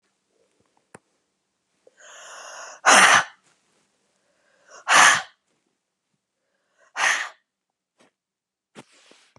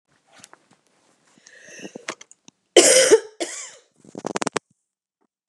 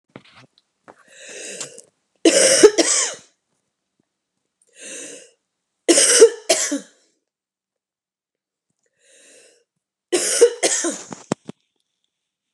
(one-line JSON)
{"exhalation_length": "9.4 s", "exhalation_amplitude": 28220, "exhalation_signal_mean_std_ratio": 0.26, "cough_length": "5.5 s", "cough_amplitude": 32537, "cough_signal_mean_std_ratio": 0.27, "three_cough_length": "12.5 s", "three_cough_amplitude": 32768, "three_cough_signal_mean_std_ratio": 0.32, "survey_phase": "beta (2021-08-13 to 2022-03-07)", "age": "45-64", "gender": "Female", "wearing_mask": "No", "symptom_cough_any": true, "symptom_fatigue": true, "symptom_headache": true, "symptom_change_to_sense_of_smell_or_taste": true, "symptom_onset": "3 days", "smoker_status": "Ex-smoker", "respiratory_condition_asthma": false, "respiratory_condition_other": false, "recruitment_source": "Test and Trace", "submission_delay": "2 days", "covid_test_result": "Positive", "covid_test_method": "RT-qPCR", "covid_ct_value": 22.0, "covid_ct_gene": "ORF1ab gene"}